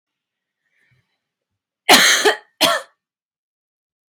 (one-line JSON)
{"cough_length": "4.1 s", "cough_amplitude": 32768, "cough_signal_mean_std_ratio": 0.3, "survey_phase": "beta (2021-08-13 to 2022-03-07)", "age": "18-44", "gender": "Female", "wearing_mask": "No", "symptom_none": true, "smoker_status": "Never smoked", "respiratory_condition_asthma": false, "respiratory_condition_other": false, "recruitment_source": "REACT", "submission_delay": "2 days", "covid_test_result": "Negative", "covid_test_method": "RT-qPCR"}